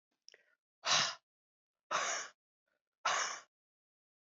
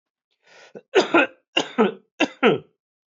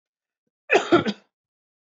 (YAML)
exhalation_length: 4.3 s
exhalation_amplitude: 4193
exhalation_signal_mean_std_ratio: 0.37
three_cough_length: 3.2 s
three_cough_amplitude: 19885
three_cough_signal_mean_std_ratio: 0.37
cough_length: 2.0 s
cough_amplitude: 18539
cough_signal_mean_std_ratio: 0.3
survey_phase: beta (2021-08-13 to 2022-03-07)
age: 45-64
gender: Male
wearing_mask: 'No'
symptom_cough_any: true
symptom_runny_or_blocked_nose: true
symptom_fever_high_temperature: true
symptom_loss_of_taste: true
symptom_onset: 3 days
smoker_status: Ex-smoker
respiratory_condition_asthma: false
respiratory_condition_other: false
recruitment_source: Test and Trace
submission_delay: 2 days
covid_test_result: Positive
covid_test_method: RT-qPCR
covid_ct_value: 14.9
covid_ct_gene: ORF1ab gene
covid_ct_mean: 15.2
covid_viral_load: 10000000 copies/ml
covid_viral_load_category: High viral load (>1M copies/ml)